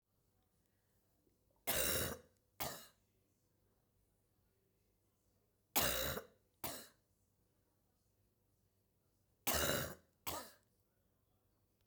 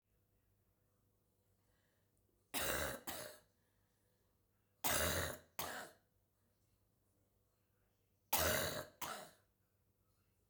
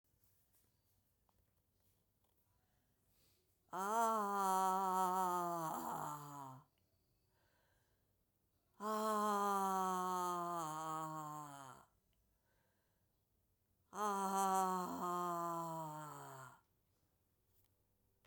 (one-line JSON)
{"three_cough_length": "11.9 s", "three_cough_amplitude": 3971, "three_cough_signal_mean_std_ratio": 0.32, "cough_length": "10.5 s", "cough_amplitude": 2810, "cough_signal_mean_std_ratio": 0.36, "exhalation_length": "18.3 s", "exhalation_amplitude": 1872, "exhalation_signal_mean_std_ratio": 0.53, "survey_phase": "beta (2021-08-13 to 2022-03-07)", "age": "65+", "gender": "Female", "wearing_mask": "No", "symptom_cough_any": true, "symptom_new_continuous_cough": true, "symptom_runny_or_blocked_nose": true, "symptom_sore_throat": true, "symptom_fatigue": true, "symptom_fever_high_temperature": true, "symptom_headache": true, "symptom_change_to_sense_of_smell_or_taste": true, "symptom_loss_of_taste": true, "smoker_status": "Never smoked", "respiratory_condition_asthma": false, "respiratory_condition_other": false, "recruitment_source": "Test and Trace", "submission_delay": "3 days", "covid_test_result": "Positive", "covid_test_method": "RT-qPCR", "covid_ct_value": 16.9, "covid_ct_gene": "ORF1ab gene", "covid_ct_mean": 17.3, "covid_viral_load": "2100000 copies/ml", "covid_viral_load_category": "High viral load (>1M copies/ml)"}